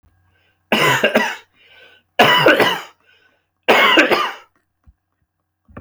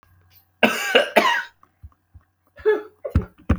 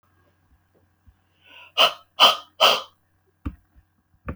{
  "three_cough_length": "5.8 s",
  "three_cough_amplitude": 32768,
  "three_cough_signal_mean_std_ratio": 0.46,
  "cough_length": "3.6 s",
  "cough_amplitude": 29843,
  "cough_signal_mean_std_ratio": 0.42,
  "exhalation_length": "4.4 s",
  "exhalation_amplitude": 30611,
  "exhalation_signal_mean_std_ratio": 0.28,
  "survey_phase": "beta (2021-08-13 to 2022-03-07)",
  "age": "45-64",
  "gender": "Male",
  "wearing_mask": "No",
  "symptom_none": true,
  "smoker_status": "Ex-smoker",
  "respiratory_condition_asthma": false,
  "respiratory_condition_other": false,
  "recruitment_source": "REACT",
  "submission_delay": "1 day",
  "covid_test_result": "Negative",
  "covid_test_method": "RT-qPCR"
}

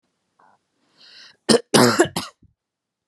{
  "cough_length": "3.1 s",
  "cough_amplitude": 32767,
  "cough_signal_mean_std_ratio": 0.3,
  "survey_phase": "beta (2021-08-13 to 2022-03-07)",
  "age": "18-44",
  "gender": "Female",
  "wearing_mask": "No",
  "symptom_none": true,
  "smoker_status": "Never smoked",
  "respiratory_condition_asthma": false,
  "respiratory_condition_other": false,
  "recruitment_source": "REACT",
  "submission_delay": "1 day",
  "covid_test_result": "Negative",
  "covid_test_method": "RT-qPCR",
  "influenza_a_test_result": "Negative",
  "influenza_b_test_result": "Negative"
}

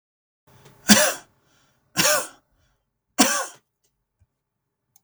{
  "three_cough_length": "5.0 s",
  "three_cough_amplitude": 32768,
  "three_cough_signal_mean_std_ratio": 0.29,
  "survey_phase": "beta (2021-08-13 to 2022-03-07)",
  "age": "45-64",
  "gender": "Male",
  "wearing_mask": "No",
  "symptom_none": true,
  "smoker_status": "Never smoked",
  "respiratory_condition_asthma": false,
  "respiratory_condition_other": false,
  "recruitment_source": "REACT",
  "submission_delay": "2 days",
  "covid_test_result": "Negative",
  "covid_test_method": "RT-qPCR",
  "influenza_a_test_result": "Negative",
  "influenza_b_test_result": "Negative"
}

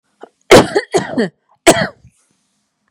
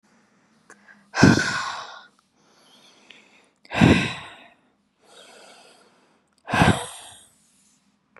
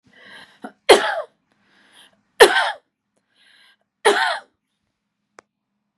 {
  "cough_length": "2.9 s",
  "cough_amplitude": 32768,
  "cough_signal_mean_std_ratio": 0.36,
  "exhalation_length": "8.2 s",
  "exhalation_amplitude": 32404,
  "exhalation_signal_mean_std_ratio": 0.3,
  "three_cough_length": "6.0 s",
  "three_cough_amplitude": 32768,
  "three_cough_signal_mean_std_ratio": 0.27,
  "survey_phase": "beta (2021-08-13 to 2022-03-07)",
  "age": "45-64",
  "gender": "Female",
  "wearing_mask": "No",
  "symptom_cough_any": true,
  "symptom_onset": "5 days",
  "smoker_status": "Ex-smoker",
  "respiratory_condition_asthma": true,
  "respiratory_condition_other": false,
  "recruitment_source": "Test and Trace",
  "submission_delay": "3 days",
  "covid_test_result": "Negative",
  "covid_test_method": "ePCR"
}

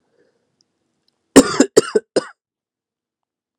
{
  "cough_length": "3.6 s",
  "cough_amplitude": 32768,
  "cough_signal_mean_std_ratio": 0.22,
  "survey_phase": "alpha (2021-03-01 to 2021-08-12)",
  "age": "18-44",
  "gender": "Male",
  "wearing_mask": "No",
  "symptom_shortness_of_breath": true,
  "symptom_fatigue": true,
  "symptom_fever_high_temperature": true,
  "symptom_change_to_sense_of_smell_or_taste": true,
  "symptom_onset": "4 days",
  "smoker_status": "Ex-smoker",
  "respiratory_condition_asthma": false,
  "respiratory_condition_other": false,
  "recruitment_source": "Test and Trace",
  "submission_delay": "2 days",
  "covid_test_result": "Positive",
  "covid_test_method": "RT-qPCR",
  "covid_ct_value": 11.3,
  "covid_ct_gene": "N gene",
  "covid_ct_mean": 11.7,
  "covid_viral_load": "150000000 copies/ml",
  "covid_viral_load_category": "High viral load (>1M copies/ml)"
}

